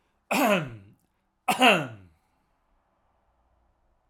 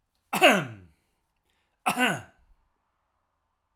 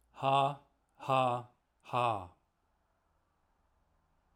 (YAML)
three_cough_length: 4.1 s
three_cough_amplitude: 19594
three_cough_signal_mean_std_ratio: 0.33
cough_length: 3.8 s
cough_amplitude: 17502
cough_signal_mean_std_ratio: 0.3
exhalation_length: 4.4 s
exhalation_amplitude: 5748
exhalation_signal_mean_std_ratio: 0.37
survey_phase: alpha (2021-03-01 to 2021-08-12)
age: 65+
gender: Male
wearing_mask: 'No'
symptom_none: true
smoker_status: Never smoked
recruitment_source: REACT
submission_delay: 1 day
covid_test_result: Negative
covid_test_method: RT-qPCR